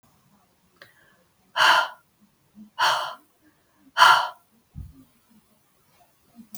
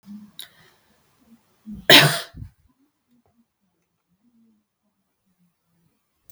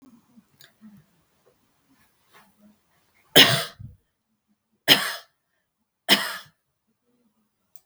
{"exhalation_length": "6.6 s", "exhalation_amplitude": 27501, "exhalation_signal_mean_std_ratio": 0.29, "cough_length": "6.3 s", "cough_amplitude": 32768, "cough_signal_mean_std_ratio": 0.18, "three_cough_length": "7.9 s", "three_cough_amplitude": 32768, "three_cough_signal_mean_std_ratio": 0.21, "survey_phase": "beta (2021-08-13 to 2022-03-07)", "age": "45-64", "gender": "Female", "wearing_mask": "No", "symptom_none": true, "smoker_status": "Never smoked", "respiratory_condition_asthma": false, "respiratory_condition_other": false, "recruitment_source": "REACT", "submission_delay": "3 days", "covid_test_result": "Negative", "covid_test_method": "RT-qPCR"}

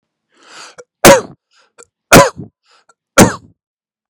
{"three_cough_length": "4.1 s", "three_cough_amplitude": 32768, "three_cough_signal_mean_std_ratio": 0.3, "survey_phase": "beta (2021-08-13 to 2022-03-07)", "age": "18-44", "gender": "Male", "wearing_mask": "No", "symptom_none": true, "smoker_status": "Ex-smoker", "respiratory_condition_asthma": false, "respiratory_condition_other": false, "recruitment_source": "REACT", "submission_delay": "1 day", "covid_test_result": "Negative", "covid_test_method": "RT-qPCR", "influenza_a_test_result": "Negative", "influenza_b_test_result": "Negative"}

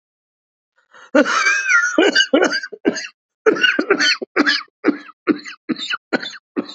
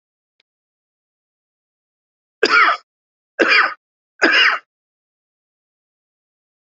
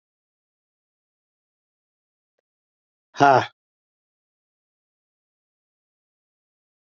{"cough_length": "6.7 s", "cough_amplitude": 30973, "cough_signal_mean_std_ratio": 0.54, "three_cough_length": "6.7 s", "three_cough_amplitude": 28178, "three_cough_signal_mean_std_ratio": 0.31, "exhalation_length": "7.0 s", "exhalation_amplitude": 27355, "exhalation_signal_mean_std_ratio": 0.14, "survey_phase": "alpha (2021-03-01 to 2021-08-12)", "age": "45-64", "gender": "Male", "wearing_mask": "No", "symptom_cough_any": true, "symptom_shortness_of_breath": true, "symptom_fatigue": true, "symptom_change_to_sense_of_smell_or_taste": true, "symptom_onset": "3 days", "smoker_status": "Never smoked", "respiratory_condition_asthma": false, "respiratory_condition_other": false, "recruitment_source": "Test and Trace", "submission_delay": "2 days", "covid_test_result": "Positive", "covid_test_method": "RT-qPCR", "covid_ct_value": 19.5, "covid_ct_gene": "ORF1ab gene", "covid_ct_mean": 20.2, "covid_viral_load": "240000 copies/ml", "covid_viral_load_category": "Low viral load (10K-1M copies/ml)"}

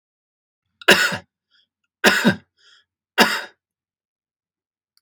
{"three_cough_length": "5.0 s", "three_cough_amplitude": 32768, "three_cough_signal_mean_std_ratio": 0.29, "survey_phase": "beta (2021-08-13 to 2022-03-07)", "age": "45-64", "gender": "Male", "wearing_mask": "No", "symptom_none": true, "smoker_status": "Never smoked", "respiratory_condition_asthma": false, "respiratory_condition_other": false, "recruitment_source": "REACT", "submission_delay": "3 days", "covid_test_result": "Negative", "covid_test_method": "RT-qPCR", "influenza_a_test_result": "Negative", "influenza_b_test_result": "Negative"}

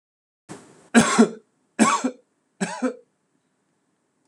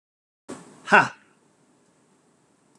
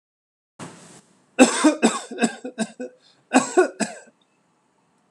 {"three_cough_length": "4.3 s", "three_cough_amplitude": 24777, "three_cough_signal_mean_std_ratio": 0.33, "exhalation_length": "2.8 s", "exhalation_amplitude": 25897, "exhalation_signal_mean_std_ratio": 0.2, "cough_length": "5.1 s", "cough_amplitude": 26028, "cough_signal_mean_std_ratio": 0.35, "survey_phase": "beta (2021-08-13 to 2022-03-07)", "age": "45-64", "gender": "Male", "wearing_mask": "No", "symptom_none": true, "smoker_status": "Never smoked", "respiratory_condition_asthma": false, "respiratory_condition_other": false, "recruitment_source": "REACT", "submission_delay": "4 days", "covid_test_result": "Negative", "covid_test_method": "RT-qPCR", "influenza_a_test_result": "Unknown/Void", "influenza_b_test_result": "Unknown/Void"}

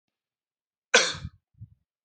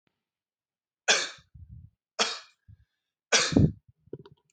{"cough_length": "2.0 s", "cough_amplitude": 22424, "cough_signal_mean_std_ratio": 0.23, "three_cough_length": "4.5 s", "three_cough_amplitude": 15743, "three_cough_signal_mean_std_ratio": 0.31, "survey_phase": "beta (2021-08-13 to 2022-03-07)", "age": "18-44", "gender": "Male", "wearing_mask": "No", "symptom_none": true, "smoker_status": "Never smoked", "respiratory_condition_asthma": false, "respiratory_condition_other": false, "recruitment_source": "REACT", "submission_delay": "4 days", "covid_test_result": "Negative", "covid_test_method": "RT-qPCR", "influenza_a_test_result": "Unknown/Void", "influenza_b_test_result": "Unknown/Void"}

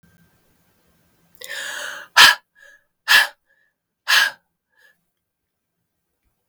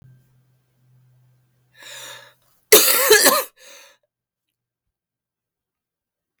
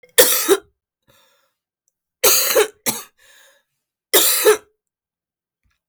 {"exhalation_length": "6.5 s", "exhalation_amplitude": 32768, "exhalation_signal_mean_std_ratio": 0.25, "cough_length": "6.4 s", "cough_amplitude": 32768, "cough_signal_mean_std_ratio": 0.27, "three_cough_length": "5.9 s", "three_cough_amplitude": 32768, "three_cough_signal_mean_std_ratio": 0.37, "survey_phase": "beta (2021-08-13 to 2022-03-07)", "age": "45-64", "gender": "Female", "wearing_mask": "No", "symptom_cough_any": true, "symptom_new_continuous_cough": true, "symptom_runny_or_blocked_nose": true, "symptom_sore_throat": true, "symptom_abdominal_pain": true, "symptom_diarrhoea": true, "symptom_fatigue": true, "symptom_fever_high_temperature": true, "symptom_headache": true, "symptom_change_to_sense_of_smell_or_taste": true, "symptom_onset": "5 days", "smoker_status": "Never smoked", "respiratory_condition_asthma": false, "respiratory_condition_other": false, "recruitment_source": "Test and Trace", "submission_delay": "3 days", "covid_test_result": "Positive", "covid_test_method": "RT-qPCR", "covid_ct_value": 26.1, "covid_ct_gene": "S gene", "covid_ct_mean": 26.5, "covid_viral_load": "2100 copies/ml", "covid_viral_load_category": "Minimal viral load (< 10K copies/ml)"}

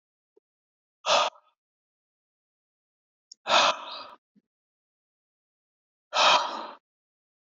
{"exhalation_length": "7.4 s", "exhalation_amplitude": 14683, "exhalation_signal_mean_std_ratio": 0.29, "survey_phase": "beta (2021-08-13 to 2022-03-07)", "age": "45-64", "gender": "Male", "wearing_mask": "No", "symptom_none": true, "smoker_status": "Never smoked", "respiratory_condition_asthma": false, "respiratory_condition_other": false, "recruitment_source": "REACT", "submission_delay": "1 day", "covid_test_result": "Negative", "covid_test_method": "RT-qPCR", "influenza_a_test_result": "Negative", "influenza_b_test_result": "Negative"}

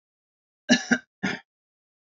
{"cough_length": "2.1 s", "cough_amplitude": 17659, "cough_signal_mean_std_ratio": 0.27, "survey_phase": "beta (2021-08-13 to 2022-03-07)", "age": "45-64", "gender": "Male", "wearing_mask": "No", "symptom_cough_any": true, "symptom_onset": "12 days", "smoker_status": "Never smoked", "respiratory_condition_asthma": false, "respiratory_condition_other": false, "recruitment_source": "REACT", "submission_delay": "2 days", "covid_test_result": "Negative", "covid_test_method": "RT-qPCR"}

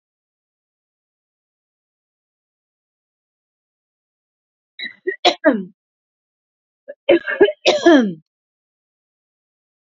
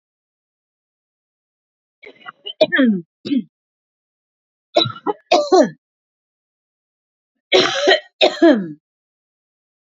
{"cough_length": "9.8 s", "cough_amplitude": 32767, "cough_signal_mean_std_ratio": 0.25, "three_cough_length": "9.9 s", "three_cough_amplitude": 29923, "three_cough_signal_mean_std_ratio": 0.34, "survey_phase": "beta (2021-08-13 to 2022-03-07)", "age": "45-64", "gender": "Female", "wearing_mask": "No", "symptom_none": true, "smoker_status": "Never smoked", "respiratory_condition_asthma": false, "respiratory_condition_other": false, "recruitment_source": "REACT", "submission_delay": "2 days", "covid_test_result": "Negative", "covid_test_method": "RT-qPCR"}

